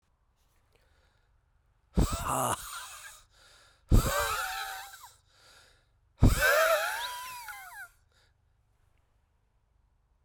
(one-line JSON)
{"exhalation_length": "10.2 s", "exhalation_amplitude": 13853, "exhalation_signal_mean_std_ratio": 0.37, "survey_phase": "beta (2021-08-13 to 2022-03-07)", "age": "45-64", "gender": "Male", "wearing_mask": "Yes", "symptom_cough_any": true, "symptom_runny_or_blocked_nose": true, "symptom_sore_throat": true, "symptom_abdominal_pain": true, "symptom_fatigue": true, "symptom_headache": true, "symptom_change_to_sense_of_smell_or_taste": true, "symptom_onset": "3 days", "smoker_status": "Never smoked", "respiratory_condition_asthma": true, "respiratory_condition_other": false, "recruitment_source": "Test and Trace", "submission_delay": "1 day", "covid_test_result": "Positive", "covid_test_method": "RT-qPCR", "covid_ct_value": 13.6, "covid_ct_gene": "ORF1ab gene", "covid_ct_mean": 13.9, "covid_viral_load": "27000000 copies/ml", "covid_viral_load_category": "High viral load (>1M copies/ml)"}